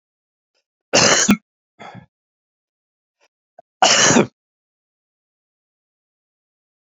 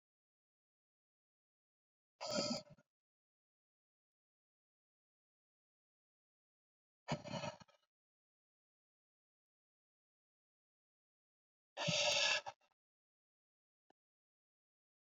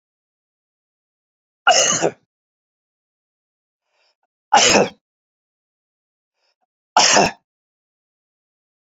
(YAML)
cough_length: 7.0 s
cough_amplitude: 32767
cough_signal_mean_std_ratio: 0.28
exhalation_length: 15.2 s
exhalation_amplitude: 2095
exhalation_signal_mean_std_ratio: 0.23
three_cough_length: 8.9 s
three_cough_amplitude: 29969
three_cough_signal_mean_std_ratio: 0.27
survey_phase: beta (2021-08-13 to 2022-03-07)
age: 65+
gender: Male
wearing_mask: 'No'
symptom_cough_any: true
symptom_runny_or_blocked_nose: true
symptom_onset: 3 days
smoker_status: Never smoked
respiratory_condition_asthma: false
respiratory_condition_other: false
recruitment_source: Test and Trace
submission_delay: 2 days
covid_test_result: Positive
covid_test_method: RT-qPCR
covid_ct_value: 16.6
covid_ct_gene: ORF1ab gene
covid_ct_mean: 16.9
covid_viral_load: 2800000 copies/ml
covid_viral_load_category: High viral load (>1M copies/ml)